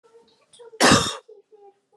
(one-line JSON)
{"cough_length": "2.0 s", "cough_amplitude": 23373, "cough_signal_mean_std_ratio": 0.33, "survey_phase": "beta (2021-08-13 to 2022-03-07)", "age": "18-44", "gender": "Female", "wearing_mask": "No", "symptom_cough_any": true, "symptom_runny_or_blocked_nose": true, "symptom_fatigue": true, "symptom_headache": true, "symptom_change_to_sense_of_smell_or_taste": true, "symptom_loss_of_taste": true, "symptom_onset": "4 days", "smoker_status": "Never smoked", "respiratory_condition_asthma": false, "respiratory_condition_other": false, "recruitment_source": "Test and Trace", "submission_delay": "2 days", "covid_test_result": "Positive", "covid_test_method": "RT-qPCR", "covid_ct_value": 22.9, "covid_ct_gene": "N gene"}